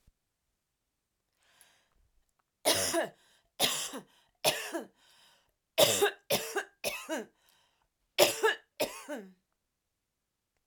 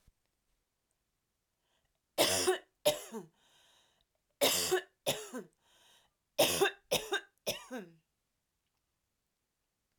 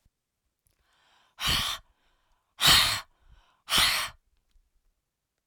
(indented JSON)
{
  "cough_length": "10.7 s",
  "cough_amplitude": 14262,
  "cough_signal_mean_std_ratio": 0.35,
  "three_cough_length": "10.0 s",
  "three_cough_amplitude": 6092,
  "three_cough_signal_mean_std_ratio": 0.34,
  "exhalation_length": "5.5 s",
  "exhalation_amplitude": 15651,
  "exhalation_signal_mean_std_ratio": 0.34,
  "survey_phase": "alpha (2021-03-01 to 2021-08-12)",
  "age": "45-64",
  "gender": "Female",
  "wearing_mask": "No",
  "symptom_none": true,
  "smoker_status": "Ex-smoker",
  "respiratory_condition_asthma": false,
  "respiratory_condition_other": false,
  "recruitment_source": "REACT",
  "submission_delay": "1 day",
  "covid_test_result": "Negative",
  "covid_test_method": "RT-qPCR"
}